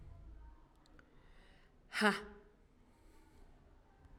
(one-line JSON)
{"exhalation_length": "4.2 s", "exhalation_amplitude": 4698, "exhalation_signal_mean_std_ratio": 0.3, "survey_phase": "alpha (2021-03-01 to 2021-08-12)", "age": "18-44", "gender": "Female", "wearing_mask": "No", "symptom_none": true, "symptom_onset": "13 days", "smoker_status": "Prefer not to say", "respiratory_condition_asthma": false, "respiratory_condition_other": false, "recruitment_source": "REACT", "submission_delay": "32 days", "covid_test_result": "Negative", "covid_test_method": "RT-qPCR"}